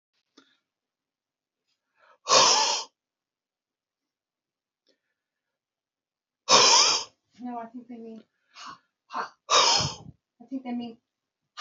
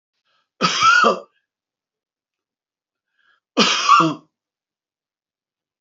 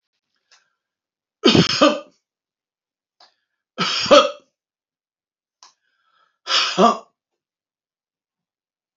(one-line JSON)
{"exhalation_length": "11.6 s", "exhalation_amplitude": 29558, "exhalation_signal_mean_std_ratio": 0.32, "cough_length": "5.8 s", "cough_amplitude": 29161, "cough_signal_mean_std_ratio": 0.35, "three_cough_length": "9.0 s", "three_cough_amplitude": 30060, "three_cough_signal_mean_std_ratio": 0.28, "survey_phase": "alpha (2021-03-01 to 2021-08-12)", "age": "65+", "gender": "Male", "wearing_mask": "No", "symptom_none": true, "smoker_status": "Ex-smoker", "respiratory_condition_asthma": false, "respiratory_condition_other": false, "recruitment_source": "REACT", "submission_delay": "2 days", "covid_test_result": "Negative", "covid_test_method": "RT-qPCR"}